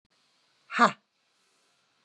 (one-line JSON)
{"exhalation_length": "2.0 s", "exhalation_amplitude": 17444, "exhalation_signal_mean_std_ratio": 0.2, "survey_phase": "beta (2021-08-13 to 2022-03-07)", "age": "45-64", "gender": "Female", "wearing_mask": "No", "symptom_cough_any": true, "symptom_runny_or_blocked_nose": true, "smoker_status": "Ex-smoker", "respiratory_condition_asthma": false, "respiratory_condition_other": false, "recruitment_source": "Test and Trace", "submission_delay": "2 days", "covid_test_result": "Positive", "covid_test_method": "RT-qPCR", "covid_ct_value": 20.8, "covid_ct_gene": "N gene"}